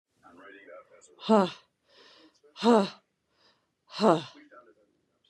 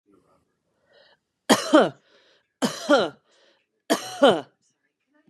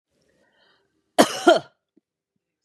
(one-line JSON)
{"exhalation_length": "5.3 s", "exhalation_amplitude": 15045, "exhalation_signal_mean_std_ratio": 0.27, "three_cough_length": "5.3 s", "three_cough_amplitude": 27422, "three_cough_signal_mean_std_ratio": 0.31, "cough_length": "2.6 s", "cough_amplitude": 32570, "cough_signal_mean_std_ratio": 0.24, "survey_phase": "beta (2021-08-13 to 2022-03-07)", "age": "18-44", "gender": "Female", "wearing_mask": "No", "symptom_none": true, "smoker_status": "Never smoked", "respiratory_condition_asthma": false, "respiratory_condition_other": true, "recruitment_source": "REACT", "submission_delay": "2 days", "covid_test_result": "Negative", "covid_test_method": "RT-qPCR", "influenza_a_test_result": "Negative", "influenza_b_test_result": "Negative"}